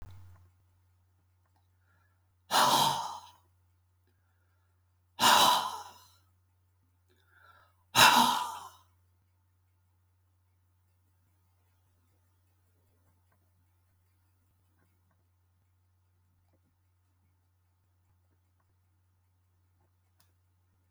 {
  "exhalation_length": "20.9 s",
  "exhalation_amplitude": 12620,
  "exhalation_signal_mean_std_ratio": 0.23,
  "survey_phase": "beta (2021-08-13 to 2022-03-07)",
  "age": "65+",
  "gender": "Male",
  "wearing_mask": "No",
  "symptom_none": true,
  "smoker_status": "Never smoked",
  "respiratory_condition_asthma": false,
  "respiratory_condition_other": false,
  "recruitment_source": "REACT",
  "submission_delay": "1 day",
  "covid_test_result": "Negative",
  "covid_test_method": "RT-qPCR"
}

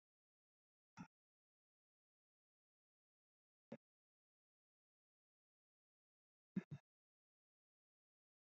{
  "exhalation_length": "8.4 s",
  "exhalation_amplitude": 662,
  "exhalation_signal_mean_std_ratio": 0.1,
  "survey_phase": "beta (2021-08-13 to 2022-03-07)",
  "age": "18-44",
  "gender": "Female",
  "wearing_mask": "No",
  "symptom_cough_any": true,
  "symptom_new_continuous_cough": true,
  "symptom_runny_or_blocked_nose": true,
  "symptom_sore_throat": true,
  "symptom_fatigue": true,
  "symptom_fever_high_temperature": true,
  "symptom_headache": true,
  "symptom_other": true,
  "symptom_onset": "3 days",
  "smoker_status": "Never smoked",
  "respiratory_condition_asthma": false,
  "respiratory_condition_other": false,
  "recruitment_source": "Test and Trace",
  "submission_delay": "2 days",
  "covid_test_result": "Positive",
  "covid_test_method": "RT-qPCR"
}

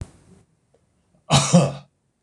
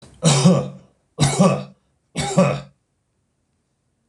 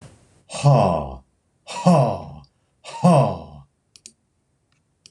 {
  "cough_length": "2.2 s",
  "cough_amplitude": 25941,
  "cough_signal_mean_std_ratio": 0.33,
  "three_cough_length": "4.1 s",
  "three_cough_amplitude": 26027,
  "three_cough_signal_mean_std_ratio": 0.44,
  "exhalation_length": "5.1 s",
  "exhalation_amplitude": 24502,
  "exhalation_signal_mean_std_ratio": 0.41,
  "survey_phase": "beta (2021-08-13 to 2022-03-07)",
  "age": "45-64",
  "gender": "Male",
  "wearing_mask": "No",
  "symptom_none": true,
  "smoker_status": "Never smoked",
  "respiratory_condition_asthma": false,
  "respiratory_condition_other": false,
  "recruitment_source": "REACT",
  "submission_delay": "13 days",
  "covid_test_result": "Negative",
  "covid_test_method": "RT-qPCR"
}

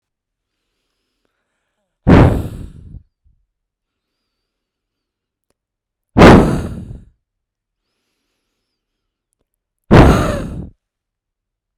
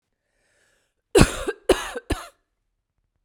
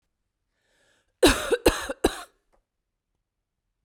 {
  "exhalation_length": "11.8 s",
  "exhalation_amplitude": 32768,
  "exhalation_signal_mean_std_ratio": 0.27,
  "three_cough_length": "3.2 s",
  "three_cough_amplitude": 32768,
  "three_cough_signal_mean_std_ratio": 0.27,
  "cough_length": "3.8 s",
  "cough_amplitude": 21281,
  "cough_signal_mean_std_ratio": 0.27,
  "survey_phase": "beta (2021-08-13 to 2022-03-07)",
  "age": "18-44",
  "gender": "Female",
  "wearing_mask": "No",
  "symptom_cough_any": true,
  "symptom_runny_or_blocked_nose": true,
  "symptom_shortness_of_breath": true,
  "symptom_headache": true,
  "symptom_onset": "2 days",
  "smoker_status": "Never smoked",
  "respiratory_condition_asthma": true,
  "respiratory_condition_other": false,
  "recruitment_source": "Test and Trace",
  "submission_delay": "2 days",
  "covid_test_result": "Negative",
  "covid_test_method": "RT-qPCR"
}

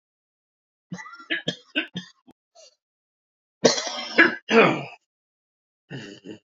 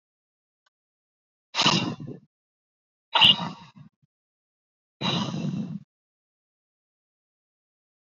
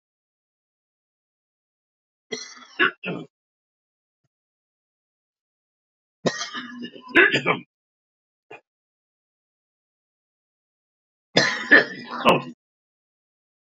{
  "cough_length": "6.5 s",
  "cough_amplitude": 29801,
  "cough_signal_mean_std_ratio": 0.3,
  "exhalation_length": "8.0 s",
  "exhalation_amplitude": 20801,
  "exhalation_signal_mean_std_ratio": 0.29,
  "three_cough_length": "13.7 s",
  "three_cough_amplitude": 28025,
  "three_cough_signal_mean_std_ratio": 0.25,
  "survey_phase": "beta (2021-08-13 to 2022-03-07)",
  "age": "65+",
  "gender": "Male",
  "wearing_mask": "No",
  "symptom_cough_any": true,
  "symptom_runny_or_blocked_nose": true,
  "symptom_sore_throat": true,
  "symptom_diarrhoea": true,
  "symptom_headache": true,
  "symptom_onset": "1 day",
  "smoker_status": "Ex-smoker",
  "respiratory_condition_asthma": false,
  "respiratory_condition_other": false,
  "recruitment_source": "Test and Trace",
  "submission_delay": "1 day",
  "covid_test_result": "Positive",
  "covid_test_method": "LAMP"
}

